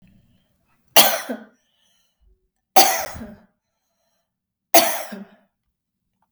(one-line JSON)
{"three_cough_length": "6.3 s", "three_cough_amplitude": 32768, "three_cough_signal_mean_std_ratio": 0.26, "survey_phase": "beta (2021-08-13 to 2022-03-07)", "age": "45-64", "gender": "Female", "wearing_mask": "No", "symptom_none": true, "symptom_onset": "11 days", "smoker_status": "Never smoked", "respiratory_condition_asthma": false, "respiratory_condition_other": false, "recruitment_source": "REACT", "submission_delay": "2 days", "covid_test_result": "Negative", "covid_test_method": "RT-qPCR", "influenza_a_test_result": "Negative", "influenza_b_test_result": "Negative"}